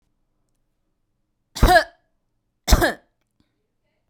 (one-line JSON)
{"cough_length": "4.1 s", "cough_amplitude": 32767, "cough_signal_mean_std_ratio": 0.25, "survey_phase": "beta (2021-08-13 to 2022-03-07)", "age": "18-44", "gender": "Female", "wearing_mask": "No", "symptom_other": true, "smoker_status": "Never smoked", "respiratory_condition_asthma": false, "respiratory_condition_other": false, "recruitment_source": "REACT", "submission_delay": "6 days", "covid_test_result": "Negative", "covid_test_method": "RT-qPCR", "influenza_a_test_result": "Negative", "influenza_b_test_result": "Negative"}